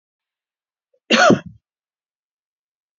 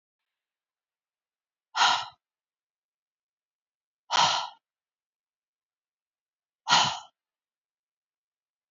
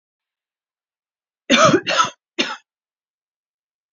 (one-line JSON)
{"cough_length": "3.0 s", "cough_amplitude": 30363, "cough_signal_mean_std_ratio": 0.24, "exhalation_length": "8.7 s", "exhalation_amplitude": 17098, "exhalation_signal_mean_std_ratio": 0.24, "three_cough_length": "3.9 s", "three_cough_amplitude": 32768, "three_cough_signal_mean_std_ratio": 0.31, "survey_phase": "beta (2021-08-13 to 2022-03-07)", "age": "45-64", "gender": "Female", "wearing_mask": "No", "symptom_none": true, "smoker_status": "Ex-smoker", "respiratory_condition_asthma": true, "respiratory_condition_other": false, "recruitment_source": "REACT", "submission_delay": "2 days", "covid_test_result": "Negative", "covid_test_method": "RT-qPCR", "influenza_a_test_result": "Negative", "influenza_b_test_result": "Negative"}